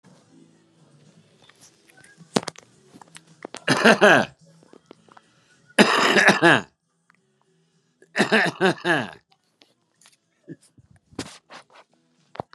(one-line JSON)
{"three_cough_length": "12.5 s", "three_cough_amplitude": 32730, "three_cough_signal_mean_std_ratio": 0.3, "survey_phase": "beta (2021-08-13 to 2022-03-07)", "age": "65+", "gender": "Male", "wearing_mask": "No", "symptom_none": true, "smoker_status": "Current smoker (11 or more cigarettes per day)", "respiratory_condition_asthma": false, "respiratory_condition_other": false, "recruitment_source": "REACT", "submission_delay": "3 days", "covid_test_result": "Negative", "covid_test_method": "RT-qPCR", "influenza_a_test_result": "Negative", "influenza_b_test_result": "Negative"}